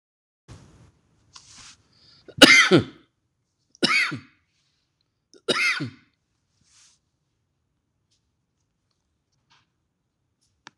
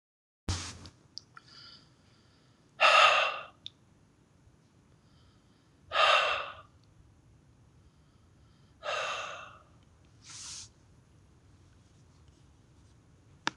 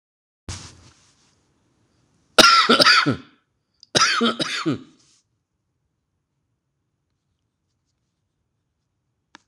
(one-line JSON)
{"three_cough_length": "10.8 s", "three_cough_amplitude": 26028, "three_cough_signal_mean_std_ratio": 0.22, "exhalation_length": "13.6 s", "exhalation_amplitude": 12659, "exhalation_signal_mean_std_ratio": 0.29, "cough_length": "9.5 s", "cough_amplitude": 26028, "cough_signal_mean_std_ratio": 0.29, "survey_phase": "alpha (2021-03-01 to 2021-08-12)", "age": "65+", "gender": "Male", "wearing_mask": "No", "symptom_cough_any": true, "smoker_status": "Ex-smoker", "respiratory_condition_asthma": false, "respiratory_condition_other": false, "recruitment_source": "REACT", "submission_delay": "1 day", "covid_test_result": "Negative", "covid_test_method": "RT-qPCR"}